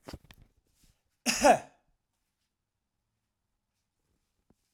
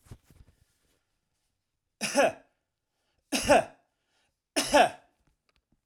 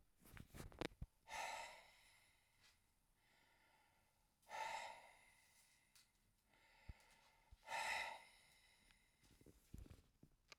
{"cough_length": "4.7 s", "cough_amplitude": 11131, "cough_signal_mean_std_ratio": 0.19, "three_cough_length": "5.9 s", "three_cough_amplitude": 11997, "three_cough_signal_mean_std_ratio": 0.29, "exhalation_length": "10.6 s", "exhalation_amplitude": 1313, "exhalation_signal_mean_std_ratio": 0.42, "survey_phase": "alpha (2021-03-01 to 2021-08-12)", "age": "65+", "gender": "Male", "wearing_mask": "No", "symptom_none": true, "smoker_status": "Never smoked", "respiratory_condition_asthma": false, "respiratory_condition_other": false, "recruitment_source": "REACT", "submission_delay": "2 days", "covid_test_result": "Negative", "covid_test_method": "RT-qPCR"}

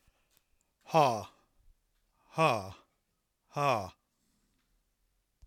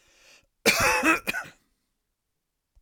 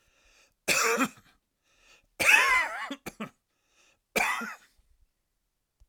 {"exhalation_length": "5.5 s", "exhalation_amplitude": 8358, "exhalation_signal_mean_std_ratio": 0.3, "cough_length": "2.8 s", "cough_amplitude": 23519, "cough_signal_mean_std_ratio": 0.39, "three_cough_length": "5.9 s", "three_cough_amplitude": 14605, "three_cough_signal_mean_std_ratio": 0.38, "survey_phase": "alpha (2021-03-01 to 2021-08-12)", "age": "65+", "gender": "Male", "wearing_mask": "No", "symptom_none": true, "smoker_status": "Never smoked", "respiratory_condition_asthma": false, "respiratory_condition_other": false, "recruitment_source": "REACT", "submission_delay": "3 days", "covid_test_result": "Negative", "covid_test_method": "RT-qPCR"}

